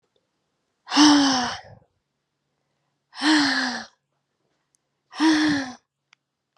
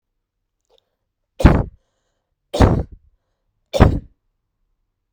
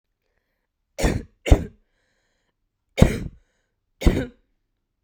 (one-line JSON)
{"exhalation_length": "6.6 s", "exhalation_amplitude": 26346, "exhalation_signal_mean_std_ratio": 0.42, "three_cough_length": "5.1 s", "three_cough_amplitude": 32768, "three_cough_signal_mean_std_ratio": 0.27, "cough_length": "5.0 s", "cough_amplitude": 32768, "cough_signal_mean_std_ratio": 0.25, "survey_phase": "beta (2021-08-13 to 2022-03-07)", "age": "18-44", "gender": "Female", "wearing_mask": "No", "symptom_cough_any": true, "symptom_runny_or_blocked_nose": true, "symptom_sore_throat": true, "symptom_change_to_sense_of_smell_or_taste": true, "symptom_loss_of_taste": true, "symptom_onset": "4 days", "smoker_status": "Current smoker (11 or more cigarettes per day)", "respiratory_condition_asthma": false, "respiratory_condition_other": false, "recruitment_source": "Test and Trace", "submission_delay": "2 days", "covid_test_result": "Positive", "covid_test_method": "RT-qPCR", "covid_ct_value": 15.6, "covid_ct_gene": "ORF1ab gene", "covid_ct_mean": 16.0, "covid_viral_load": "5500000 copies/ml", "covid_viral_load_category": "High viral load (>1M copies/ml)"}